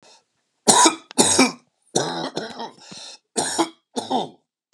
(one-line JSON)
{"three_cough_length": "4.7 s", "three_cough_amplitude": 32767, "three_cough_signal_mean_std_ratio": 0.43, "survey_phase": "beta (2021-08-13 to 2022-03-07)", "age": "45-64", "gender": "Male", "wearing_mask": "No", "symptom_none": true, "smoker_status": "Never smoked", "respiratory_condition_asthma": false, "respiratory_condition_other": false, "recruitment_source": "REACT", "submission_delay": "2 days", "covid_test_result": "Negative", "covid_test_method": "RT-qPCR"}